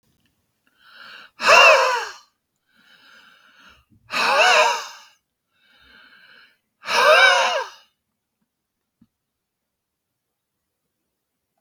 {
  "exhalation_length": "11.6 s",
  "exhalation_amplitude": 32766,
  "exhalation_signal_mean_std_ratio": 0.33,
  "survey_phase": "beta (2021-08-13 to 2022-03-07)",
  "age": "65+",
  "gender": "Male",
  "wearing_mask": "No",
  "symptom_none": true,
  "smoker_status": "Never smoked",
  "respiratory_condition_asthma": false,
  "respiratory_condition_other": false,
  "recruitment_source": "REACT",
  "submission_delay": "2 days",
  "covid_test_result": "Negative",
  "covid_test_method": "RT-qPCR",
  "influenza_a_test_result": "Negative",
  "influenza_b_test_result": "Negative"
}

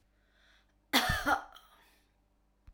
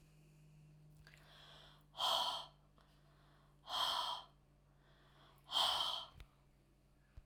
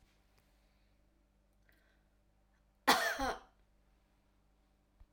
{
  "cough_length": "2.7 s",
  "cough_amplitude": 8745,
  "cough_signal_mean_std_ratio": 0.33,
  "exhalation_length": "7.3 s",
  "exhalation_amplitude": 2161,
  "exhalation_signal_mean_std_ratio": 0.43,
  "three_cough_length": "5.1 s",
  "three_cough_amplitude": 7198,
  "three_cough_signal_mean_std_ratio": 0.24,
  "survey_phase": "alpha (2021-03-01 to 2021-08-12)",
  "age": "45-64",
  "gender": "Female",
  "wearing_mask": "No",
  "symptom_none": true,
  "smoker_status": "Never smoked",
  "respiratory_condition_asthma": false,
  "respiratory_condition_other": false,
  "recruitment_source": "REACT",
  "submission_delay": "1 day",
  "covid_test_result": "Negative",
  "covid_test_method": "RT-qPCR"
}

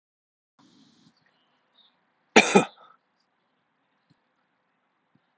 {
  "cough_length": "5.4 s",
  "cough_amplitude": 31919,
  "cough_signal_mean_std_ratio": 0.15,
  "survey_phase": "alpha (2021-03-01 to 2021-08-12)",
  "age": "45-64",
  "gender": "Male",
  "wearing_mask": "No",
  "symptom_none": true,
  "smoker_status": "Never smoked",
  "respiratory_condition_asthma": false,
  "respiratory_condition_other": false,
  "recruitment_source": "REACT",
  "submission_delay": "2 days",
  "covid_test_result": "Negative",
  "covid_test_method": "RT-qPCR"
}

